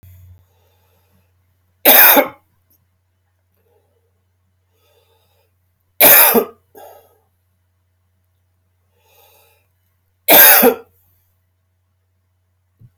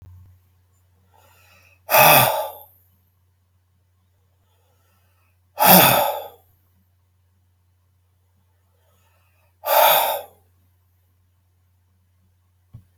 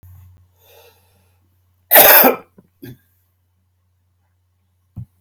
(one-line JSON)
{"three_cough_length": "13.0 s", "three_cough_amplitude": 32768, "three_cough_signal_mean_std_ratio": 0.26, "exhalation_length": "13.0 s", "exhalation_amplitude": 32768, "exhalation_signal_mean_std_ratio": 0.28, "cough_length": "5.2 s", "cough_amplitude": 32768, "cough_signal_mean_std_ratio": 0.25, "survey_phase": "alpha (2021-03-01 to 2021-08-12)", "age": "65+", "gender": "Male", "wearing_mask": "No", "symptom_none": true, "smoker_status": "Ex-smoker", "respiratory_condition_asthma": false, "respiratory_condition_other": false, "recruitment_source": "REACT", "submission_delay": "1 day", "covid_test_result": "Negative", "covid_test_method": "RT-qPCR"}